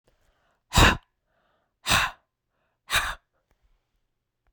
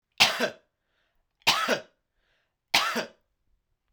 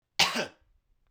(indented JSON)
{
  "exhalation_length": "4.5 s",
  "exhalation_amplitude": 21800,
  "exhalation_signal_mean_std_ratio": 0.27,
  "three_cough_length": "3.9 s",
  "three_cough_amplitude": 22603,
  "three_cough_signal_mean_std_ratio": 0.35,
  "cough_length": "1.1 s",
  "cough_amplitude": 12949,
  "cough_signal_mean_std_ratio": 0.35,
  "survey_phase": "beta (2021-08-13 to 2022-03-07)",
  "age": "45-64",
  "gender": "Male",
  "wearing_mask": "No",
  "symptom_none": true,
  "symptom_onset": "13 days",
  "smoker_status": "Ex-smoker",
  "respiratory_condition_asthma": false,
  "respiratory_condition_other": false,
  "recruitment_source": "REACT",
  "submission_delay": "2 days",
  "covid_test_result": "Negative",
  "covid_test_method": "RT-qPCR"
}